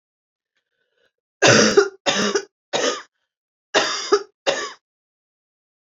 {"three_cough_length": "5.8 s", "three_cough_amplitude": 32767, "three_cough_signal_mean_std_ratio": 0.39, "survey_phase": "beta (2021-08-13 to 2022-03-07)", "age": "45-64", "gender": "Female", "wearing_mask": "No", "symptom_cough_any": true, "symptom_new_continuous_cough": true, "symptom_runny_or_blocked_nose": true, "symptom_shortness_of_breath": true, "symptom_sore_throat": true, "symptom_abdominal_pain": true, "symptom_fatigue": true, "symptom_headache": true, "symptom_change_to_sense_of_smell_or_taste": true, "symptom_loss_of_taste": true, "symptom_onset": "5 days", "smoker_status": "Never smoked", "respiratory_condition_asthma": false, "respiratory_condition_other": false, "recruitment_source": "Test and Trace", "submission_delay": "2 days", "covid_test_result": "Positive", "covid_test_method": "RT-qPCR", "covid_ct_value": 14.7, "covid_ct_gene": "ORF1ab gene", "covid_ct_mean": 15.0, "covid_viral_load": "12000000 copies/ml", "covid_viral_load_category": "High viral load (>1M copies/ml)"}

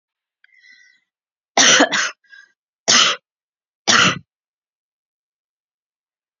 {"three_cough_length": "6.4 s", "three_cough_amplitude": 32767, "three_cough_signal_mean_std_ratio": 0.32, "survey_phase": "beta (2021-08-13 to 2022-03-07)", "age": "45-64", "gender": "Female", "wearing_mask": "No", "symptom_none": true, "smoker_status": "Never smoked", "respiratory_condition_asthma": false, "respiratory_condition_other": false, "recruitment_source": "REACT", "submission_delay": "2 days", "covid_test_result": "Negative", "covid_test_method": "RT-qPCR"}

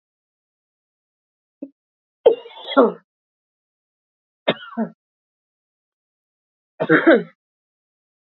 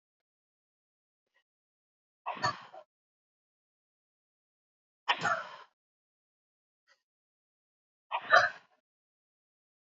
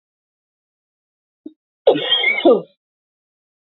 {"three_cough_length": "8.3 s", "three_cough_amplitude": 27747, "three_cough_signal_mean_std_ratio": 0.23, "exhalation_length": "10.0 s", "exhalation_amplitude": 11445, "exhalation_signal_mean_std_ratio": 0.2, "cough_length": "3.7 s", "cough_amplitude": 27448, "cough_signal_mean_std_ratio": 0.33, "survey_phase": "beta (2021-08-13 to 2022-03-07)", "age": "18-44", "gender": "Female", "wearing_mask": "No", "symptom_none": true, "smoker_status": "Never smoked", "respiratory_condition_asthma": true, "respiratory_condition_other": false, "recruitment_source": "REACT", "submission_delay": "2 days", "covid_test_result": "Negative", "covid_test_method": "RT-qPCR", "influenza_a_test_result": "Negative", "influenza_b_test_result": "Negative"}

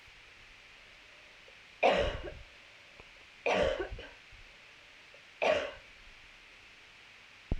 {"three_cough_length": "7.6 s", "three_cough_amplitude": 6209, "three_cough_signal_mean_std_ratio": 0.4, "survey_phase": "alpha (2021-03-01 to 2021-08-12)", "age": "18-44", "gender": "Female", "wearing_mask": "No", "symptom_cough_any": true, "symptom_shortness_of_breath": true, "symptom_fatigue": true, "symptom_fever_high_temperature": true, "symptom_headache": true, "symptom_onset": "4 days", "smoker_status": "Never smoked", "respiratory_condition_asthma": false, "respiratory_condition_other": false, "recruitment_source": "Test and Trace", "submission_delay": "2 days", "covid_test_result": "Positive", "covid_test_method": "RT-qPCR", "covid_ct_value": 17.4, "covid_ct_gene": "ORF1ab gene", "covid_ct_mean": 18.2, "covid_viral_load": "1100000 copies/ml", "covid_viral_load_category": "High viral load (>1M copies/ml)"}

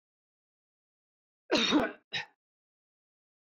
{"cough_length": "3.4 s", "cough_amplitude": 7264, "cough_signal_mean_std_ratio": 0.29, "survey_phase": "beta (2021-08-13 to 2022-03-07)", "age": "65+", "gender": "Male", "wearing_mask": "No", "symptom_none": true, "smoker_status": "Ex-smoker", "respiratory_condition_asthma": false, "respiratory_condition_other": false, "recruitment_source": "REACT", "submission_delay": "3 days", "covid_test_result": "Negative", "covid_test_method": "RT-qPCR", "influenza_a_test_result": "Negative", "influenza_b_test_result": "Negative"}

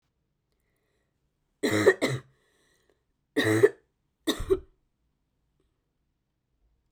{"three_cough_length": "6.9 s", "three_cough_amplitude": 16939, "three_cough_signal_mean_std_ratio": 0.28, "survey_phase": "beta (2021-08-13 to 2022-03-07)", "age": "18-44", "gender": "Female", "wearing_mask": "No", "symptom_cough_any": true, "symptom_runny_or_blocked_nose": true, "symptom_sore_throat": true, "symptom_fatigue": true, "symptom_headache": true, "smoker_status": "Never smoked", "respiratory_condition_asthma": false, "respiratory_condition_other": false, "recruitment_source": "Test and Trace", "submission_delay": "1 day", "covid_test_result": "Positive", "covid_test_method": "RT-qPCR", "covid_ct_value": 29.6, "covid_ct_gene": "N gene", "covid_ct_mean": 30.1, "covid_viral_load": "130 copies/ml", "covid_viral_load_category": "Minimal viral load (< 10K copies/ml)"}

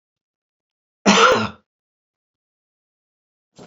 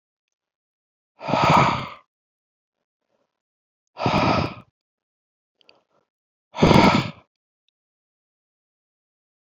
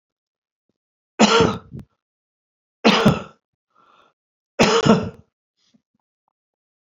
{"cough_length": "3.7 s", "cough_amplitude": 28919, "cough_signal_mean_std_ratio": 0.27, "exhalation_length": "9.6 s", "exhalation_amplitude": 29849, "exhalation_signal_mean_std_ratio": 0.31, "three_cough_length": "6.8 s", "three_cough_amplitude": 32767, "three_cough_signal_mean_std_ratio": 0.32, "survey_phase": "beta (2021-08-13 to 2022-03-07)", "age": "65+", "gender": "Male", "wearing_mask": "No", "symptom_none": true, "smoker_status": "Never smoked", "respiratory_condition_asthma": false, "respiratory_condition_other": false, "recruitment_source": "REACT", "submission_delay": "1 day", "covid_test_result": "Negative", "covid_test_method": "RT-qPCR", "influenza_a_test_result": "Unknown/Void", "influenza_b_test_result": "Unknown/Void"}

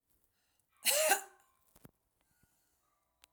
{"cough_length": "3.3 s", "cough_amplitude": 6879, "cough_signal_mean_std_ratio": 0.27, "survey_phase": "alpha (2021-03-01 to 2021-08-12)", "age": "45-64", "gender": "Female", "wearing_mask": "No", "symptom_none": true, "smoker_status": "Ex-smoker", "respiratory_condition_asthma": false, "respiratory_condition_other": false, "recruitment_source": "REACT", "submission_delay": "5 days", "covid_test_result": "Negative", "covid_test_method": "RT-qPCR"}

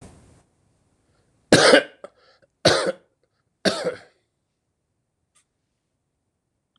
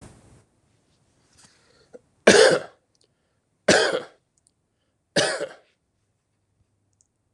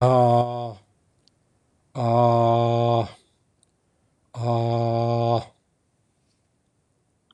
{"cough_length": "6.8 s", "cough_amplitude": 26028, "cough_signal_mean_std_ratio": 0.25, "three_cough_length": "7.3 s", "three_cough_amplitude": 26028, "three_cough_signal_mean_std_ratio": 0.26, "exhalation_length": "7.3 s", "exhalation_amplitude": 13982, "exhalation_signal_mean_std_ratio": 0.53, "survey_phase": "beta (2021-08-13 to 2022-03-07)", "age": "65+", "gender": "Male", "wearing_mask": "No", "symptom_cough_any": true, "symptom_new_continuous_cough": true, "symptom_runny_or_blocked_nose": true, "symptom_sore_throat": true, "symptom_fatigue": true, "symptom_headache": true, "smoker_status": "Never smoked", "respiratory_condition_asthma": false, "respiratory_condition_other": false, "recruitment_source": "REACT", "submission_delay": "2 days", "covid_test_result": "Negative", "covid_test_method": "RT-qPCR", "influenza_a_test_result": "Negative", "influenza_b_test_result": "Negative"}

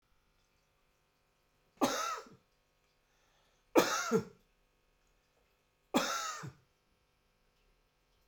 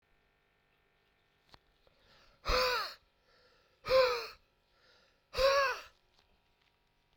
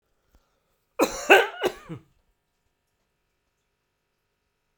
{"three_cough_length": "8.3 s", "three_cough_amplitude": 8911, "three_cough_signal_mean_std_ratio": 0.29, "exhalation_length": "7.2 s", "exhalation_amplitude": 4573, "exhalation_signal_mean_std_ratio": 0.34, "cough_length": "4.8 s", "cough_amplitude": 27635, "cough_signal_mean_std_ratio": 0.22, "survey_phase": "beta (2021-08-13 to 2022-03-07)", "age": "45-64", "gender": "Male", "wearing_mask": "No", "symptom_cough_any": true, "symptom_other": true, "smoker_status": "Ex-smoker", "respiratory_condition_asthma": false, "respiratory_condition_other": false, "recruitment_source": "Test and Trace", "submission_delay": "2 days", "covid_test_result": "Positive", "covid_test_method": "RT-qPCR", "covid_ct_value": 24.9, "covid_ct_gene": "ORF1ab gene"}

